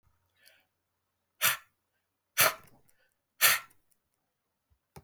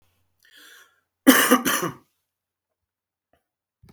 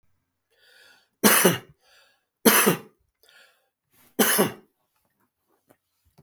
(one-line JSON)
{"exhalation_length": "5.0 s", "exhalation_amplitude": 12657, "exhalation_signal_mean_std_ratio": 0.24, "cough_length": "3.9 s", "cough_amplitude": 32766, "cough_signal_mean_std_ratio": 0.27, "three_cough_length": "6.2 s", "three_cough_amplitude": 32766, "three_cough_signal_mean_std_ratio": 0.3, "survey_phase": "beta (2021-08-13 to 2022-03-07)", "age": "45-64", "gender": "Male", "wearing_mask": "No", "symptom_runny_or_blocked_nose": true, "symptom_other": true, "smoker_status": "Current smoker (1 to 10 cigarettes per day)", "respiratory_condition_asthma": false, "respiratory_condition_other": false, "recruitment_source": "Test and Trace", "submission_delay": "2 days", "covid_test_result": "Positive", "covid_test_method": "RT-qPCR", "covid_ct_value": 16.7, "covid_ct_gene": "ORF1ab gene", "covid_ct_mean": 17.0, "covid_viral_load": "2600000 copies/ml", "covid_viral_load_category": "High viral load (>1M copies/ml)"}